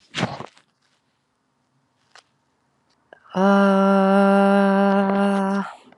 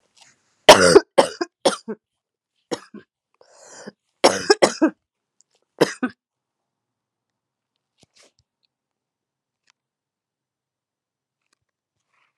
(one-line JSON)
{"exhalation_length": "6.0 s", "exhalation_amplitude": 20692, "exhalation_signal_mean_std_ratio": 0.54, "cough_length": "12.4 s", "cough_amplitude": 32768, "cough_signal_mean_std_ratio": 0.2, "survey_phase": "alpha (2021-03-01 to 2021-08-12)", "age": "18-44", "gender": "Female", "wearing_mask": "Yes", "symptom_fatigue": true, "symptom_change_to_sense_of_smell_or_taste": true, "symptom_loss_of_taste": true, "symptom_onset": "4 days", "smoker_status": "Current smoker (1 to 10 cigarettes per day)", "respiratory_condition_asthma": false, "respiratory_condition_other": false, "recruitment_source": "Test and Trace", "submission_delay": "2 days", "covid_test_result": "Positive", "covid_test_method": "RT-qPCR"}